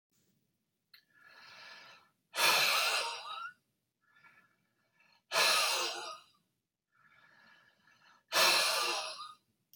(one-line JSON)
{"exhalation_length": "9.8 s", "exhalation_amplitude": 6051, "exhalation_signal_mean_std_ratio": 0.43, "survey_phase": "beta (2021-08-13 to 2022-03-07)", "age": "45-64", "gender": "Male", "wearing_mask": "No", "symptom_cough_any": true, "symptom_new_continuous_cough": true, "symptom_change_to_sense_of_smell_or_taste": true, "symptom_loss_of_taste": true, "smoker_status": "Ex-smoker", "respiratory_condition_asthma": false, "respiratory_condition_other": false, "recruitment_source": "Test and Trace", "submission_delay": "-1 day", "covid_test_result": "Positive", "covid_test_method": "LFT"}